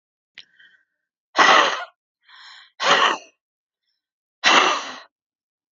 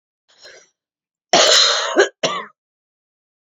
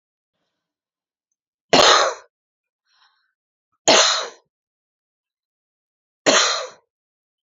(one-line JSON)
{"exhalation_length": "5.7 s", "exhalation_amplitude": 28171, "exhalation_signal_mean_std_ratio": 0.36, "cough_length": "3.4 s", "cough_amplitude": 30402, "cough_signal_mean_std_ratio": 0.4, "three_cough_length": "7.5 s", "three_cough_amplitude": 31225, "three_cough_signal_mean_std_ratio": 0.3, "survey_phase": "beta (2021-08-13 to 2022-03-07)", "age": "45-64", "gender": "Female", "wearing_mask": "Yes", "symptom_cough_any": true, "symptom_runny_or_blocked_nose": true, "symptom_fatigue": true, "symptom_headache": true, "symptom_change_to_sense_of_smell_or_taste": true, "symptom_other": true, "symptom_onset": "2 days", "smoker_status": "Current smoker (1 to 10 cigarettes per day)", "respiratory_condition_asthma": false, "respiratory_condition_other": false, "recruitment_source": "Test and Trace", "submission_delay": "2 days", "covid_test_result": "Positive", "covid_test_method": "RT-qPCR", "covid_ct_value": 23.5, "covid_ct_gene": "ORF1ab gene"}